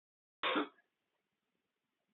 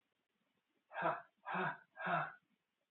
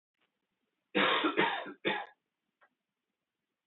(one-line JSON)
{"cough_length": "2.1 s", "cough_amplitude": 2534, "cough_signal_mean_std_ratio": 0.27, "exhalation_length": "2.9 s", "exhalation_amplitude": 1816, "exhalation_signal_mean_std_ratio": 0.45, "three_cough_length": "3.7 s", "three_cough_amplitude": 5870, "three_cough_signal_mean_std_ratio": 0.39, "survey_phase": "alpha (2021-03-01 to 2021-08-12)", "age": "18-44", "gender": "Male", "wearing_mask": "No", "symptom_diarrhoea": true, "symptom_headache": true, "symptom_change_to_sense_of_smell_or_taste": true, "smoker_status": "Ex-smoker", "respiratory_condition_asthma": false, "respiratory_condition_other": false, "recruitment_source": "Test and Trace", "submission_delay": "1 day", "covid_test_result": "Positive", "covid_test_method": "RT-qPCR", "covid_ct_value": 12.7, "covid_ct_gene": "ORF1ab gene", "covid_ct_mean": 13.0, "covid_viral_load": "56000000 copies/ml", "covid_viral_load_category": "High viral load (>1M copies/ml)"}